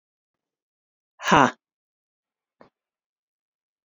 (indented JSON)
{
  "exhalation_length": "3.8 s",
  "exhalation_amplitude": 28744,
  "exhalation_signal_mean_std_ratio": 0.17,
  "survey_phase": "beta (2021-08-13 to 2022-03-07)",
  "age": "65+",
  "gender": "Female",
  "wearing_mask": "No",
  "symptom_none": true,
  "smoker_status": "Never smoked",
  "respiratory_condition_asthma": true,
  "respiratory_condition_other": false,
  "recruitment_source": "REACT",
  "submission_delay": "4 days",
  "covid_test_result": "Negative",
  "covid_test_method": "RT-qPCR",
  "influenza_a_test_result": "Negative",
  "influenza_b_test_result": "Negative"
}